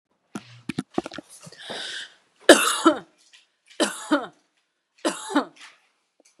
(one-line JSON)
{"three_cough_length": "6.4 s", "three_cough_amplitude": 32768, "three_cough_signal_mean_std_ratio": 0.29, "survey_phase": "beta (2021-08-13 to 2022-03-07)", "age": "45-64", "gender": "Female", "wearing_mask": "No", "symptom_none": true, "smoker_status": "Ex-smoker", "respiratory_condition_asthma": false, "respiratory_condition_other": false, "recruitment_source": "REACT", "submission_delay": "3 days", "covid_test_result": "Negative", "covid_test_method": "RT-qPCR", "influenza_a_test_result": "Negative", "influenza_b_test_result": "Negative"}